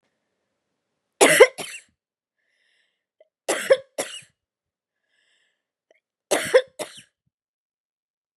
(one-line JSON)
{"three_cough_length": "8.4 s", "three_cough_amplitude": 32462, "three_cough_signal_mean_std_ratio": 0.22, "survey_phase": "beta (2021-08-13 to 2022-03-07)", "age": "45-64", "gender": "Female", "wearing_mask": "No", "symptom_none": true, "symptom_onset": "5 days", "smoker_status": "Never smoked", "respiratory_condition_asthma": false, "respiratory_condition_other": false, "recruitment_source": "REACT", "submission_delay": "1 day", "covid_test_result": "Negative", "covid_test_method": "RT-qPCR", "influenza_a_test_result": "Negative", "influenza_b_test_result": "Negative"}